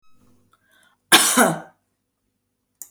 {"cough_length": "2.9 s", "cough_amplitude": 32768, "cough_signal_mean_std_ratio": 0.3, "survey_phase": "beta (2021-08-13 to 2022-03-07)", "age": "65+", "gender": "Female", "wearing_mask": "No", "symptom_none": true, "smoker_status": "Never smoked", "respiratory_condition_asthma": false, "respiratory_condition_other": false, "recruitment_source": "REACT", "submission_delay": "2 days", "covid_test_result": "Negative", "covid_test_method": "RT-qPCR", "influenza_a_test_result": "Negative", "influenza_b_test_result": "Negative"}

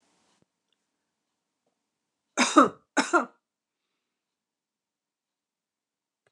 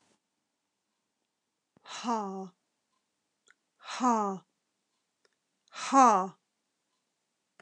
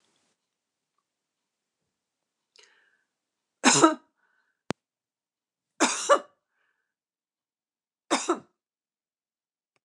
{"cough_length": "6.3 s", "cough_amplitude": 24445, "cough_signal_mean_std_ratio": 0.19, "exhalation_length": "7.6 s", "exhalation_amplitude": 12527, "exhalation_signal_mean_std_ratio": 0.27, "three_cough_length": "9.8 s", "three_cough_amplitude": 22719, "three_cough_signal_mean_std_ratio": 0.2, "survey_phase": "beta (2021-08-13 to 2022-03-07)", "age": "45-64", "gender": "Female", "wearing_mask": "No", "symptom_none": true, "smoker_status": "Never smoked", "respiratory_condition_asthma": false, "respiratory_condition_other": false, "recruitment_source": "Test and Trace", "submission_delay": "3 days", "covid_test_result": "Negative", "covid_test_method": "RT-qPCR"}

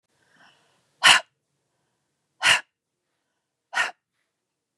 {"exhalation_length": "4.8 s", "exhalation_amplitude": 29223, "exhalation_signal_mean_std_ratio": 0.23, "survey_phase": "beta (2021-08-13 to 2022-03-07)", "age": "45-64", "gender": "Female", "wearing_mask": "No", "symptom_none": true, "smoker_status": "Ex-smoker", "respiratory_condition_asthma": false, "respiratory_condition_other": false, "recruitment_source": "REACT", "submission_delay": "2 days", "covid_test_result": "Negative", "covid_test_method": "RT-qPCR", "influenza_a_test_result": "Negative", "influenza_b_test_result": "Negative"}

